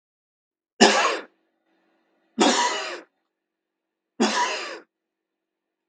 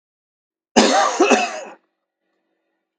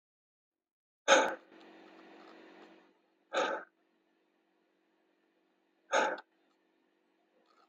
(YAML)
three_cough_length: 5.9 s
three_cough_amplitude: 32768
three_cough_signal_mean_std_ratio: 0.36
cough_length: 3.0 s
cough_amplitude: 32767
cough_signal_mean_std_ratio: 0.4
exhalation_length: 7.7 s
exhalation_amplitude: 9805
exhalation_signal_mean_std_ratio: 0.25
survey_phase: beta (2021-08-13 to 2022-03-07)
age: 45-64
gender: Male
wearing_mask: 'No'
symptom_none: true
smoker_status: Never smoked
respiratory_condition_asthma: false
respiratory_condition_other: false
recruitment_source: REACT
submission_delay: 2 days
covid_test_result: Negative
covid_test_method: RT-qPCR